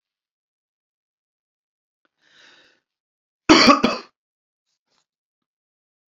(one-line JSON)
{"cough_length": "6.1 s", "cough_amplitude": 29054, "cough_signal_mean_std_ratio": 0.2, "survey_phase": "beta (2021-08-13 to 2022-03-07)", "age": "45-64", "gender": "Male", "wearing_mask": "No", "symptom_cough_any": true, "symptom_sore_throat": true, "symptom_fever_high_temperature": true, "symptom_headache": true, "symptom_onset": "3 days", "smoker_status": "Never smoked", "respiratory_condition_asthma": false, "respiratory_condition_other": false, "recruitment_source": "Test and Trace", "submission_delay": "2 days", "covid_test_result": "Positive", "covid_test_method": "ePCR"}